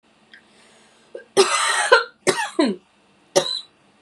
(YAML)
cough_length: 4.0 s
cough_amplitude: 32392
cough_signal_mean_std_ratio: 0.42
survey_phase: beta (2021-08-13 to 2022-03-07)
age: 18-44
gender: Female
wearing_mask: 'No'
symptom_cough_any: true
symptom_runny_or_blocked_nose: true
symptom_sore_throat: true
symptom_fever_high_temperature: true
symptom_headache: true
symptom_change_to_sense_of_smell_or_taste: true
smoker_status: Current smoker (1 to 10 cigarettes per day)
respiratory_condition_asthma: false
respiratory_condition_other: false
recruitment_source: Test and Trace
submission_delay: 1 day
covid_test_result: Positive
covid_test_method: ePCR